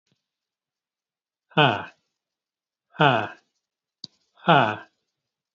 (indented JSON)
{
  "exhalation_length": "5.5 s",
  "exhalation_amplitude": 26546,
  "exhalation_signal_mean_std_ratio": 0.27,
  "survey_phase": "alpha (2021-03-01 to 2021-08-12)",
  "age": "45-64",
  "gender": "Male",
  "wearing_mask": "No",
  "symptom_none": true,
  "smoker_status": "Never smoked",
  "respiratory_condition_asthma": false,
  "respiratory_condition_other": false,
  "recruitment_source": "REACT",
  "submission_delay": "2 days",
  "covid_test_result": "Negative",
  "covid_test_method": "RT-qPCR"
}